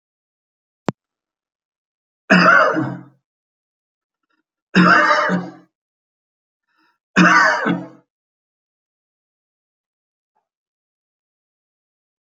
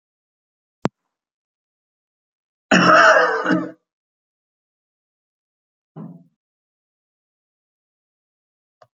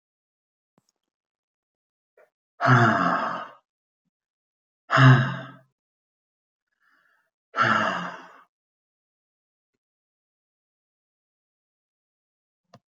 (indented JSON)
{
  "three_cough_length": "12.3 s",
  "three_cough_amplitude": 29282,
  "three_cough_signal_mean_std_ratio": 0.31,
  "cough_length": "9.0 s",
  "cough_amplitude": 31917,
  "cough_signal_mean_std_ratio": 0.25,
  "exhalation_length": "12.9 s",
  "exhalation_amplitude": 20225,
  "exhalation_signal_mean_std_ratio": 0.27,
  "survey_phase": "beta (2021-08-13 to 2022-03-07)",
  "age": "65+",
  "gender": "Male",
  "wearing_mask": "No",
  "symptom_none": true,
  "smoker_status": "Never smoked",
  "respiratory_condition_asthma": false,
  "respiratory_condition_other": false,
  "recruitment_source": "REACT",
  "submission_delay": "1 day",
  "covid_test_result": "Negative",
  "covid_test_method": "RT-qPCR"
}